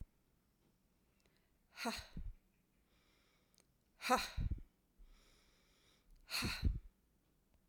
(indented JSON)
{
  "exhalation_length": "7.7 s",
  "exhalation_amplitude": 3705,
  "exhalation_signal_mean_std_ratio": 0.33,
  "survey_phase": "alpha (2021-03-01 to 2021-08-12)",
  "age": "45-64",
  "gender": "Female",
  "wearing_mask": "No",
  "symptom_none": true,
  "smoker_status": "Ex-smoker",
  "respiratory_condition_asthma": false,
  "respiratory_condition_other": false,
  "recruitment_source": "REACT",
  "submission_delay": "2 days",
  "covid_test_result": "Negative",
  "covid_test_method": "RT-qPCR"
}